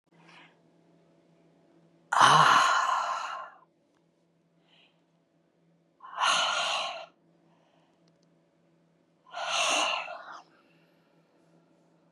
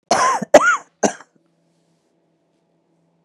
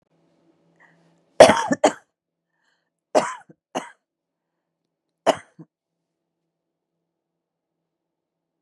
{"exhalation_length": "12.1 s", "exhalation_amplitude": 21544, "exhalation_signal_mean_std_ratio": 0.36, "cough_length": "3.2 s", "cough_amplitude": 32768, "cough_signal_mean_std_ratio": 0.32, "three_cough_length": "8.6 s", "three_cough_amplitude": 32768, "three_cough_signal_mean_std_ratio": 0.17, "survey_phase": "beta (2021-08-13 to 2022-03-07)", "age": "45-64", "gender": "Female", "wearing_mask": "No", "symptom_cough_any": true, "symptom_new_continuous_cough": true, "symptom_runny_or_blocked_nose": true, "symptom_shortness_of_breath": true, "symptom_sore_throat": true, "symptom_fatigue": true, "symptom_fever_high_temperature": true, "symptom_headache": true, "symptom_change_to_sense_of_smell_or_taste": true, "symptom_loss_of_taste": true, "smoker_status": "Ex-smoker", "respiratory_condition_asthma": false, "respiratory_condition_other": false, "recruitment_source": "Test and Trace", "submission_delay": "2 days", "covid_test_result": "Positive", "covid_test_method": "RT-qPCR", "covid_ct_value": 24.3, "covid_ct_gene": "N gene"}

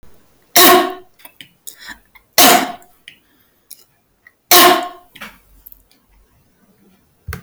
{"three_cough_length": "7.4 s", "three_cough_amplitude": 32768, "three_cough_signal_mean_std_ratio": 0.33, "survey_phase": "alpha (2021-03-01 to 2021-08-12)", "age": "45-64", "gender": "Female", "wearing_mask": "No", "symptom_none": true, "smoker_status": "Never smoked", "respiratory_condition_asthma": false, "respiratory_condition_other": false, "recruitment_source": "REACT", "submission_delay": "2 days", "covid_test_result": "Negative", "covid_test_method": "RT-qPCR"}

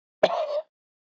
{"cough_length": "1.2 s", "cough_amplitude": 14824, "cough_signal_mean_std_ratio": 0.4, "survey_phase": "beta (2021-08-13 to 2022-03-07)", "age": "45-64", "gender": "Male", "wearing_mask": "No", "symptom_cough_any": true, "symptom_fatigue": true, "symptom_headache": true, "symptom_onset": "4 days", "smoker_status": "Current smoker (e-cigarettes or vapes only)", "respiratory_condition_asthma": true, "respiratory_condition_other": false, "recruitment_source": "Test and Trace", "submission_delay": "2 days", "covid_test_result": "Negative", "covid_test_method": "RT-qPCR"}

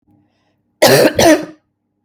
{"cough_length": "2.0 s", "cough_amplitude": 32768, "cough_signal_mean_std_ratio": 0.44, "survey_phase": "beta (2021-08-13 to 2022-03-07)", "age": "45-64", "gender": "Female", "wearing_mask": "No", "symptom_cough_any": true, "symptom_runny_or_blocked_nose": true, "symptom_shortness_of_breath": true, "symptom_sore_throat": true, "symptom_fatigue": true, "symptom_onset": "12 days", "smoker_status": "Never smoked", "respiratory_condition_asthma": false, "respiratory_condition_other": false, "recruitment_source": "REACT", "submission_delay": "0 days", "covid_test_result": "Positive", "covid_test_method": "RT-qPCR", "covid_ct_value": 36.9, "covid_ct_gene": "N gene", "influenza_a_test_result": "Negative", "influenza_b_test_result": "Negative"}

